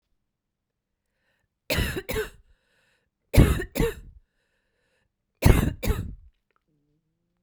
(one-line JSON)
{"three_cough_length": "7.4 s", "three_cough_amplitude": 30387, "three_cough_signal_mean_std_ratio": 0.29, "survey_phase": "beta (2021-08-13 to 2022-03-07)", "age": "45-64", "gender": "Female", "wearing_mask": "No", "symptom_cough_any": true, "symptom_runny_or_blocked_nose": true, "symptom_sore_throat": true, "symptom_onset": "3 days", "smoker_status": "Never smoked", "respiratory_condition_asthma": false, "respiratory_condition_other": false, "recruitment_source": "Test and Trace", "submission_delay": "1 day", "covid_test_result": "Positive", "covid_test_method": "ePCR"}